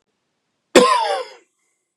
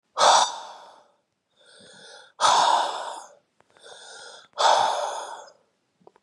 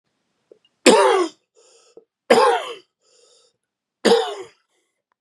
{
  "cough_length": "2.0 s",
  "cough_amplitude": 32768,
  "cough_signal_mean_std_ratio": 0.36,
  "exhalation_length": "6.2 s",
  "exhalation_amplitude": 22123,
  "exhalation_signal_mean_std_ratio": 0.44,
  "three_cough_length": "5.2 s",
  "three_cough_amplitude": 32767,
  "three_cough_signal_mean_std_ratio": 0.36,
  "survey_phase": "beta (2021-08-13 to 2022-03-07)",
  "age": "18-44",
  "gender": "Male",
  "wearing_mask": "No",
  "symptom_cough_any": true,
  "symptom_new_continuous_cough": true,
  "symptom_runny_or_blocked_nose": true,
  "symptom_sore_throat": true,
  "symptom_fatigue": true,
  "smoker_status": "Ex-smoker",
  "respiratory_condition_asthma": false,
  "respiratory_condition_other": false,
  "recruitment_source": "Test and Trace",
  "submission_delay": "0 days",
  "covid_test_result": "Positive",
  "covid_test_method": "LFT"
}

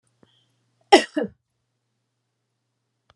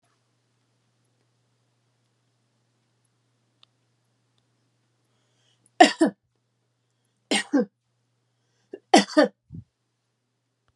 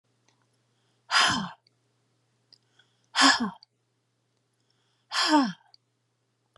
{
  "cough_length": "3.2 s",
  "cough_amplitude": 32767,
  "cough_signal_mean_std_ratio": 0.16,
  "three_cough_length": "10.8 s",
  "three_cough_amplitude": 30302,
  "three_cough_signal_mean_std_ratio": 0.18,
  "exhalation_length": "6.6 s",
  "exhalation_amplitude": 17739,
  "exhalation_signal_mean_std_ratio": 0.31,
  "survey_phase": "beta (2021-08-13 to 2022-03-07)",
  "age": "65+",
  "gender": "Female",
  "wearing_mask": "No",
  "symptom_none": true,
  "smoker_status": "Ex-smoker",
  "respiratory_condition_asthma": false,
  "respiratory_condition_other": false,
  "recruitment_source": "REACT",
  "submission_delay": "2 days",
  "covid_test_result": "Negative",
  "covid_test_method": "RT-qPCR"
}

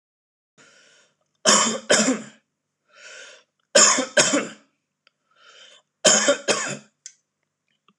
{
  "three_cough_length": "8.0 s",
  "three_cough_amplitude": 25869,
  "three_cough_signal_mean_std_ratio": 0.37,
  "survey_phase": "alpha (2021-03-01 to 2021-08-12)",
  "age": "18-44",
  "gender": "Male",
  "wearing_mask": "No",
  "symptom_none": true,
  "smoker_status": "Never smoked",
  "respiratory_condition_asthma": false,
  "respiratory_condition_other": false,
  "recruitment_source": "REACT",
  "submission_delay": "3 days",
  "covid_test_result": "Negative",
  "covid_test_method": "RT-qPCR"
}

